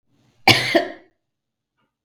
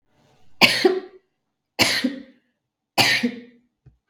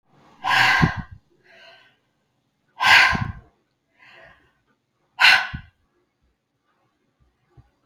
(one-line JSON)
{"cough_length": "2.0 s", "cough_amplitude": 32766, "cough_signal_mean_std_ratio": 0.3, "three_cough_length": "4.1 s", "three_cough_amplitude": 32768, "three_cough_signal_mean_std_ratio": 0.39, "exhalation_length": "7.9 s", "exhalation_amplitude": 32186, "exhalation_signal_mean_std_ratio": 0.32, "survey_phase": "beta (2021-08-13 to 2022-03-07)", "age": "45-64", "gender": "Female", "wearing_mask": "No", "symptom_none": true, "smoker_status": "Ex-smoker", "respiratory_condition_asthma": true, "respiratory_condition_other": false, "recruitment_source": "REACT", "submission_delay": "2 days", "covid_test_result": "Negative", "covid_test_method": "RT-qPCR"}